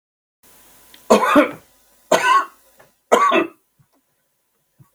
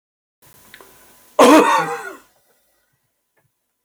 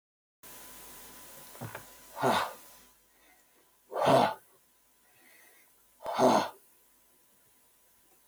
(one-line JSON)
{"three_cough_length": "4.9 s", "three_cough_amplitude": 32768, "three_cough_signal_mean_std_ratio": 0.38, "cough_length": "3.8 s", "cough_amplitude": 32768, "cough_signal_mean_std_ratio": 0.3, "exhalation_length": "8.3 s", "exhalation_amplitude": 9727, "exhalation_signal_mean_std_ratio": 0.33, "survey_phase": "beta (2021-08-13 to 2022-03-07)", "age": "65+", "gender": "Male", "wearing_mask": "No", "symptom_none": true, "smoker_status": "Never smoked", "respiratory_condition_asthma": false, "respiratory_condition_other": false, "recruitment_source": "REACT", "submission_delay": "7 days", "covid_test_result": "Negative", "covid_test_method": "RT-qPCR", "influenza_a_test_result": "Negative", "influenza_b_test_result": "Negative"}